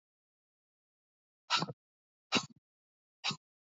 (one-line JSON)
{"exhalation_length": "3.8 s", "exhalation_amplitude": 5924, "exhalation_signal_mean_std_ratio": 0.23, "survey_phase": "beta (2021-08-13 to 2022-03-07)", "age": "18-44", "gender": "Female", "wearing_mask": "No", "symptom_cough_any": true, "symptom_runny_or_blocked_nose": true, "symptom_sore_throat": true, "symptom_fatigue": true, "symptom_fever_high_temperature": true, "symptom_headache": true, "symptom_change_to_sense_of_smell_or_taste": true, "symptom_loss_of_taste": true, "symptom_other": true, "symptom_onset": "6 days", "smoker_status": "Never smoked", "respiratory_condition_asthma": false, "respiratory_condition_other": false, "recruitment_source": "Test and Trace", "submission_delay": "4 days", "covid_test_result": "Positive", "covid_test_method": "RT-qPCR", "covid_ct_value": 18.6, "covid_ct_gene": "N gene"}